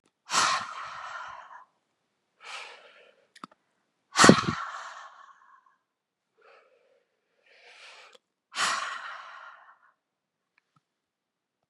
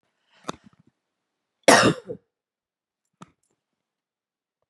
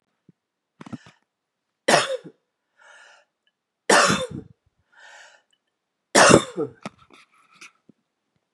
{"exhalation_length": "11.7 s", "exhalation_amplitude": 32740, "exhalation_signal_mean_std_ratio": 0.25, "cough_length": "4.7 s", "cough_amplitude": 32037, "cough_signal_mean_std_ratio": 0.19, "three_cough_length": "8.5 s", "three_cough_amplitude": 32768, "three_cough_signal_mean_std_ratio": 0.26, "survey_phase": "beta (2021-08-13 to 2022-03-07)", "age": "45-64", "gender": "Female", "wearing_mask": "No", "symptom_sore_throat": true, "symptom_fatigue": true, "symptom_headache": true, "symptom_other": true, "smoker_status": "Ex-smoker", "respiratory_condition_asthma": false, "respiratory_condition_other": false, "recruitment_source": "Test and Trace", "submission_delay": "1 day", "covid_test_result": "Positive", "covid_test_method": "ePCR"}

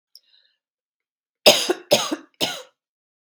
{"three_cough_length": "3.3 s", "three_cough_amplitude": 32768, "three_cough_signal_mean_std_ratio": 0.29, "survey_phase": "beta (2021-08-13 to 2022-03-07)", "age": "45-64", "gender": "Female", "wearing_mask": "No", "symptom_shortness_of_breath": true, "symptom_fatigue": true, "symptom_onset": "12 days", "smoker_status": "Never smoked", "respiratory_condition_asthma": false, "respiratory_condition_other": false, "recruitment_source": "REACT", "submission_delay": "1 day", "covid_test_result": "Negative", "covid_test_method": "RT-qPCR"}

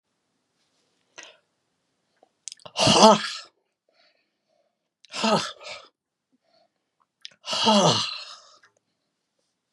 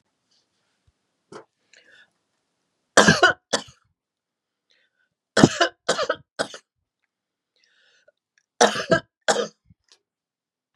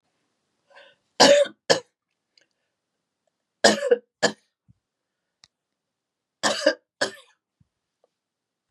{"exhalation_length": "9.7 s", "exhalation_amplitude": 32767, "exhalation_signal_mean_std_ratio": 0.28, "three_cough_length": "10.8 s", "three_cough_amplitude": 32768, "three_cough_signal_mean_std_ratio": 0.24, "cough_length": "8.7 s", "cough_amplitude": 29809, "cough_signal_mean_std_ratio": 0.25, "survey_phase": "beta (2021-08-13 to 2022-03-07)", "age": "65+", "gender": "Female", "wearing_mask": "No", "symptom_none": true, "smoker_status": "Never smoked", "respiratory_condition_asthma": false, "respiratory_condition_other": false, "recruitment_source": "REACT", "submission_delay": "4 days", "covid_test_result": "Negative", "covid_test_method": "RT-qPCR"}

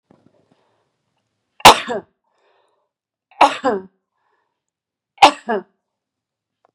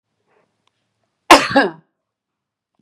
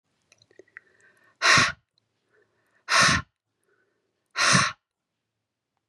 {"three_cough_length": "6.7 s", "three_cough_amplitude": 32768, "three_cough_signal_mean_std_ratio": 0.21, "cough_length": "2.8 s", "cough_amplitude": 32768, "cough_signal_mean_std_ratio": 0.24, "exhalation_length": "5.9 s", "exhalation_amplitude": 17888, "exhalation_signal_mean_std_ratio": 0.32, "survey_phase": "beta (2021-08-13 to 2022-03-07)", "age": "45-64", "gender": "Female", "wearing_mask": "No", "symptom_runny_or_blocked_nose": true, "symptom_sore_throat": true, "symptom_abdominal_pain": true, "symptom_fatigue": true, "symptom_headache": true, "symptom_onset": "2 days", "smoker_status": "Ex-smoker", "respiratory_condition_asthma": false, "respiratory_condition_other": false, "recruitment_source": "Test and Trace", "submission_delay": "1 day", "covid_test_result": "Negative", "covid_test_method": "RT-qPCR"}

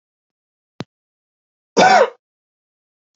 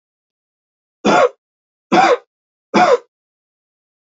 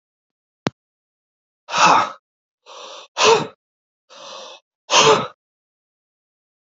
{"cough_length": "3.2 s", "cough_amplitude": 29548, "cough_signal_mean_std_ratio": 0.26, "three_cough_length": "4.0 s", "three_cough_amplitude": 29871, "three_cough_signal_mean_std_ratio": 0.36, "exhalation_length": "6.7 s", "exhalation_amplitude": 32601, "exhalation_signal_mean_std_ratio": 0.32, "survey_phase": "alpha (2021-03-01 to 2021-08-12)", "age": "45-64", "gender": "Male", "wearing_mask": "No", "symptom_none": true, "symptom_onset": "6 days", "smoker_status": "Never smoked", "respiratory_condition_asthma": false, "respiratory_condition_other": false, "recruitment_source": "REACT", "submission_delay": "1 day", "covid_test_result": "Negative", "covid_test_method": "RT-qPCR"}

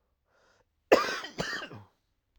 {"cough_length": "2.4 s", "cough_amplitude": 16397, "cough_signal_mean_std_ratio": 0.3, "survey_phase": "alpha (2021-03-01 to 2021-08-12)", "age": "18-44", "gender": "Male", "wearing_mask": "No", "symptom_none": true, "smoker_status": "Current smoker (11 or more cigarettes per day)", "respiratory_condition_asthma": false, "respiratory_condition_other": false, "recruitment_source": "REACT", "submission_delay": "1 day", "covid_test_result": "Negative", "covid_test_method": "RT-qPCR"}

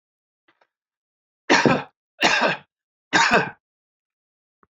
{"three_cough_length": "4.8 s", "three_cough_amplitude": 26642, "three_cough_signal_mean_std_ratio": 0.36, "survey_phase": "alpha (2021-03-01 to 2021-08-12)", "age": "65+", "gender": "Male", "wearing_mask": "No", "symptom_none": true, "smoker_status": "Never smoked", "respiratory_condition_asthma": false, "respiratory_condition_other": false, "recruitment_source": "REACT", "submission_delay": "1 day", "covid_test_result": "Negative", "covid_test_method": "RT-qPCR"}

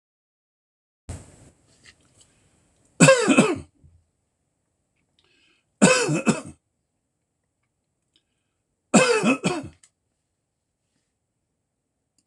{"three_cough_length": "12.3 s", "three_cough_amplitude": 26027, "three_cough_signal_mean_std_ratio": 0.28, "survey_phase": "alpha (2021-03-01 to 2021-08-12)", "age": "65+", "gender": "Male", "wearing_mask": "No", "symptom_none": true, "symptom_shortness_of_breath": true, "smoker_status": "Ex-smoker", "respiratory_condition_asthma": false, "respiratory_condition_other": false, "recruitment_source": "REACT", "submission_delay": "2 days", "covid_test_result": "Negative", "covid_test_method": "RT-qPCR"}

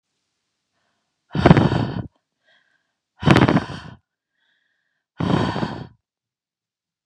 {"exhalation_length": "7.1 s", "exhalation_amplitude": 32768, "exhalation_signal_mean_std_ratio": 0.32, "survey_phase": "beta (2021-08-13 to 2022-03-07)", "age": "45-64", "gender": "Female", "wearing_mask": "No", "symptom_headache": true, "symptom_onset": "13 days", "smoker_status": "Never smoked", "respiratory_condition_asthma": false, "respiratory_condition_other": false, "recruitment_source": "REACT", "submission_delay": "1 day", "covid_test_result": "Negative", "covid_test_method": "RT-qPCR"}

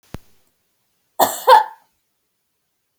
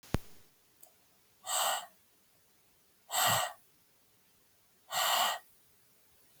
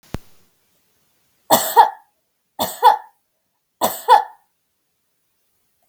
{"cough_length": "3.0 s", "cough_amplitude": 32768, "cough_signal_mean_std_ratio": 0.25, "exhalation_length": "6.4 s", "exhalation_amplitude": 6236, "exhalation_signal_mean_std_ratio": 0.39, "three_cough_length": "5.9 s", "three_cough_amplitude": 32768, "three_cough_signal_mean_std_ratio": 0.28, "survey_phase": "beta (2021-08-13 to 2022-03-07)", "age": "18-44", "gender": "Female", "wearing_mask": "No", "symptom_sore_throat": true, "symptom_abdominal_pain": true, "symptom_headache": true, "symptom_change_to_sense_of_smell_or_taste": true, "symptom_onset": "2 days", "smoker_status": "Never smoked", "respiratory_condition_asthma": false, "respiratory_condition_other": false, "recruitment_source": "Test and Trace", "submission_delay": "1 day", "covid_test_result": "Negative", "covid_test_method": "LAMP"}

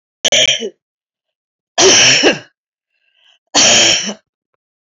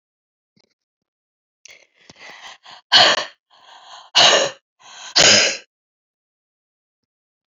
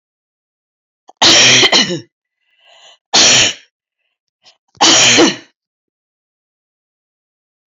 {"cough_length": "4.9 s", "cough_amplitude": 32768, "cough_signal_mean_std_ratio": 0.48, "exhalation_length": "7.6 s", "exhalation_amplitude": 32767, "exhalation_signal_mean_std_ratio": 0.3, "three_cough_length": "7.7 s", "three_cough_amplitude": 32768, "three_cough_signal_mean_std_ratio": 0.4, "survey_phase": "alpha (2021-03-01 to 2021-08-12)", "age": "65+", "gender": "Female", "wearing_mask": "No", "symptom_cough_any": true, "symptom_new_continuous_cough": true, "symptom_shortness_of_breath": true, "symptom_fatigue": true, "symptom_onset": "3 days", "smoker_status": "Never smoked", "respiratory_condition_asthma": true, "respiratory_condition_other": false, "recruitment_source": "Test and Trace", "submission_delay": "2 days", "covid_test_result": "Positive", "covid_test_method": "RT-qPCR", "covid_ct_value": 15.2, "covid_ct_gene": "S gene", "covid_ct_mean": 15.6, "covid_viral_load": "7600000 copies/ml", "covid_viral_load_category": "High viral load (>1M copies/ml)"}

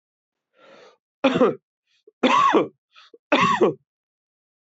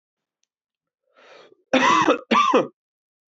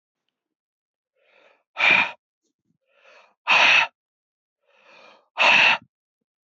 {"three_cough_length": "4.6 s", "three_cough_amplitude": 21734, "three_cough_signal_mean_std_ratio": 0.41, "cough_length": "3.3 s", "cough_amplitude": 21803, "cough_signal_mean_std_ratio": 0.41, "exhalation_length": "6.6 s", "exhalation_amplitude": 19057, "exhalation_signal_mean_std_ratio": 0.33, "survey_phase": "beta (2021-08-13 to 2022-03-07)", "age": "18-44", "gender": "Male", "wearing_mask": "No", "symptom_cough_any": true, "symptom_runny_or_blocked_nose": true, "symptom_sore_throat": true, "symptom_fatigue": true, "symptom_onset": "2 days", "smoker_status": "Never smoked", "respiratory_condition_asthma": false, "respiratory_condition_other": false, "recruitment_source": "Test and Trace", "submission_delay": "1 day", "covid_test_result": "Positive", "covid_test_method": "RT-qPCR"}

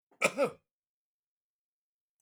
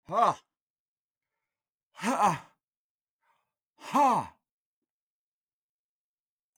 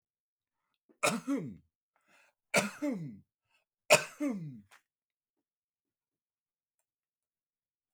{"cough_length": "2.2 s", "cough_amplitude": 8531, "cough_signal_mean_std_ratio": 0.23, "exhalation_length": "6.6 s", "exhalation_amplitude": 9532, "exhalation_signal_mean_std_ratio": 0.29, "three_cough_length": "7.9 s", "three_cough_amplitude": 14979, "three_cough_signal_mean_std_ratio": 0.27, "survey_phase": "beta (2021-08-13 to 2022-03-07)", "age": "45-64", "gender": "Male", "wearing_mask": "No", "symptom_none": true, "smoker_status": "Ex-smoker", "respiratory_condition_asthma": false, "respiratory_condition_other": false, "recruitment_source": "REACT", "submission_delay": "1 day", "covid_test_result": "Negative", "covid_test_method": "RT-qPCR", "influenza_a_test_result": "Negative", "influenza_b_test_result": "Negative"}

